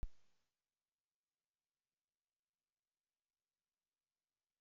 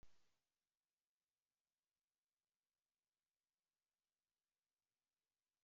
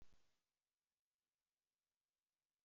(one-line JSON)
{"three_cough_length": "4.6 s", "three_cough_amplitude": 785, "three_cough_signal_mean_std_ratio": 0.13, "exhalation_length": "5.6 s", "exhalation_amplitude": 59, "exhalation_signal_mean_std_ratio": 0.2, "cough_length": "2.6 s", "cough_amplitude": 64, "cough_signal_mean_std_ratio": 0.28, "survey_phase": "beta (2021-08-13 to 2022-03-07)", "age": "18-44", "gender": "Male", "wearing_mask": "No", "symptom_cough_any": true, "symptom_new_continuous_cough": true, "symptom_runny_or_blocked_nose": true, "symptom_shortness_of_breath": true, "symptom_sore_throat": true, "symptom_fatigue": true, "symptom_fever_high_temperature": true, "symptom_headache": true, "smoker_status": "Never smoked", "respiratory_condition_asthma": false, "respiratory_condition_other": false, "recruitment_source": "Test and Trace", "submission_delay": "2 days", "covid_test_result": "Positive", "covid_test_method": "LFT"}